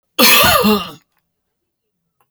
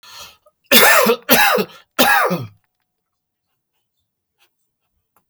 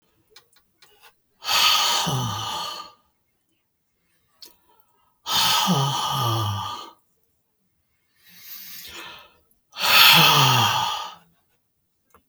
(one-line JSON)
{"cough_length": "2.3 s", "cough_amplitude": 32768, "cough_signal_mean_std_ratio": 0.46, "three_cough_length": "5.3 s", "three_cough_amplitude": 32768, "three_cough_signal_mean_std_ratio": 0.4, "exhalation_length": "12.3 s", "exhalation_amplitude": 30882, "exhalation_signal_mean_std_ratio": 0.46, "survey_phase": "alpha (2021-03-01 to 2021-08-12)", "age": "65+", "gender": "Male", "wearing_mask": "No", "symptom_none": true, "smoker_status": "Ex-smoker", "respiratory_condition_asthma": false, "respiratory_condition_other": false, "recruitment_source": "REACT", "submission_delay": "2 days", "covid_test_result": "Negative", "covid_test_method": "RT-qPCR"}